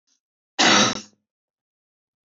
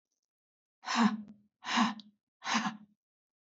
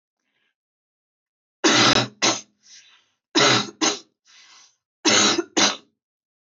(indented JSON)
{
  "cough_length": "2.3 s",
  "cough_amplitude": 20580,
  "cough_signal_mean_std_ratio": 0.32,
  "exhalation_length": "3.4 s",
  "exhalation_amplitude": 5741,
  "exhalation_signal_mean_std_ratio": 0.4,
  "three_cough_length": "6.6 s",
  "three_cough_amplitude": 22135,
  "three_cough_signal_mean_std_ratio": 0.4,
  "survey_phase": "beta (2021-08-13 to 2022-03-07)",
  "age": "18-44",
  "gender": "Female",
  "wearing_mask": "Yes",
  "symptom_fatigue": true,
  "symptom_onset": "12 days",
  "smoker_status": "Never smoked",
  "respiratory_condition_asthma": true,
  "respiratory_condition_other": false,
  "recruitment_source": "REACT",
  "submission_delay": "2 days",
  "covid_test_result": "Negative",
  "covid_test_method": "RT-qPCR",
  "influenza_a_test_result": "Negative",
  "influenza_b_test_result": "Negative"
}